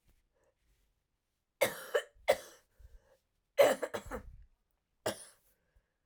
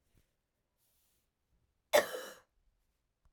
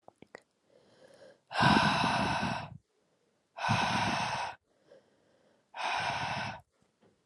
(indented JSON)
{
  "three_cough_length": "6.1 s",
  "three_cough_amplitude": 7517,
  "three_cough_signal_mean_std_ratio": 0.26,
  "cough_length": "3.3 s",
  "cough_amplitude": 7488,
  "cough_signal_mean_std_ratio": 0.18,
  "exhalation_length": "7.3 s",
  "exhalation_amplitude": 8723,
  "exhalation_signal_mean_std_ratio": 0.52,
  "survey_phase": "alpha (2021-03-01 to 2021-08-12)",
  "age": "18-44",
  "gender": "Female",
  "wearing_mask": "No",
  "symptom_cough_any": true,
  "symptom_new_continuous_cough": true,
  "symptom_fatigue": true,
  "symptom_fever_high_temperature": true,
  "symptom_headache": true,
  "smoker_status": "Never smoked",
  "respiratory_condition_asthma": false,
  "respiratory_condition_other": false,
  "recruitment_source": "Test and Trace",
  "submission_delay": "1 day",
  "covid_test_result": "Positive",
  "covid_test_method": "RT-qPCR"
}